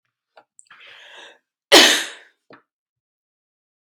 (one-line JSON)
{"cough_length": "4.0 s", "cough_amplitude": 32629, "cough_signal_mean_std_ratio": 0.22, "survey_phase": "beta (2021-08-13 to 2022-03-07)", "age": "45-64", "gender": "Female", "wearing_mask": "No", "symptom_runny_or_blocked_nose": true, "symptom_other": true, "symptom_onset": "3 days", "smoker_status": "Never smoked", "respiratory_condition_asthma": false, "respiratory_condition_other": false, "recruitment_source": "Test and Trace", "submission_delay": "2 days", "covid_test_result": "Positive", "covid_test_method": "RT-qPCR", "covid_ct_value": 17.0, "covid_ct_gene": "ORF1ab gene", "covid_ct_mean": 17.5, "covid_viral_load": "1800000 copies/ml", "covid_viral_load_category": "High viral load (>1M copies/ml)"}